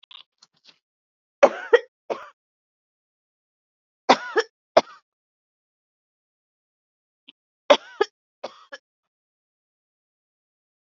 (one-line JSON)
{"three_cough_length": "10.9 s", "three_cough_amplitude": 29086, "three_cough_signal_mean_std_ratio": 0.16, "survey_phase": "beta (2021-08-13 to 2022-03-07)", "age": "45-64", "gender": "Female", "wearing_mask": "No", "symptom_none": true, "symptom_onset": "12 days", "smoker_status": "Prefer not to say", "respiratory_condition_asthma": true, "respiratory_condition_other": true, "recruitment_source": "REACT", "submission_delay": "6 days", "covid_test_result": "Negative", "covid_test_method": "RT-qPCR", "influenza_a_test_result": "Negative", "influenza_b_test_result": "Negative"}